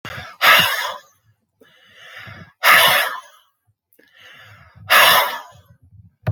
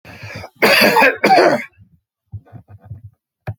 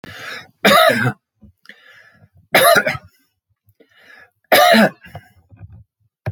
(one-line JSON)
{"exhalation_length": "6.3 s", "exhalation_amplitude": 32370, "exhalation_signal_mean_std_ratio": 0.41, "cough_length": "3.6 s", "cough_amplitude": 32767, "cough_signal_mean_std_ratio": 0.47, "three_cough_length": "6.3 s", "three_cough_amplitude": 31307, "three_cough_signal_mean_std_ratio": 0.39, "survey_phase": "alpha (2021-03-01 to 2021-08-12)", "age": "65+", "gender": "Male", "wearing_mask": "No", "symptom_none": true, "smoker_status": "Never smoked", "respiratory_condition_asthma": false, "respiratory_condition_other": false, "recruitment_source": "Test and Trace", "submission_delay": "0 days", "covid_test_result": "Negative", "covid_test_method": "LFT"}